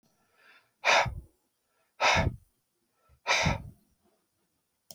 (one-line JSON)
{"exhalation_length": "4.9 s", "exhalation_amplitude": 10111, "exhalation_signal_mean_std_ratio": 0.35, "survey_phase": "beta (2021-08-13 to 2022-03-07)", "age": "65+", "gender": "Male", "wearing_mask": "No", "symptom_none": true, "smoker_status": "Never smoked", "respiratory_condition_asthma": false, "respiratory_condition_other": false, "recruitment_source": "REACT", "submission_delay": "1 day", "covid_test_result": "Negative", "covid_test_method": "RT-qPCR"}